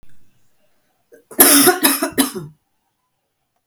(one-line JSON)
{"cough_length": "3.7 s", "cough_amplitude": 32768, "cough_signal_mean_std_ratio": 0.37, "survey_phase": "beta (2021-08-13 to 2022-03-07)", "age": "65+", "gender": "Female", "wearing_mask": "Yes", "symptom_cough_any": true, "symptom_runny_or_blocked_nose": true, "symptom_diarrhoea": true, "symptom_headache": true, "symptom_other": true, "symptom_onset": "3 days", "smoker_status": "Never smoked", "respiratory_condition_asthma": false, "respiratory_condition_other": false, "recruitment_source": "Test and Trace", "submission_delay": "1 day", "covid_test_result": "Positive", "covid_test_method": "RT-qPCR", "covid_ct_value": 23.8, "covid_ct_gene": "ORF1ab gene"}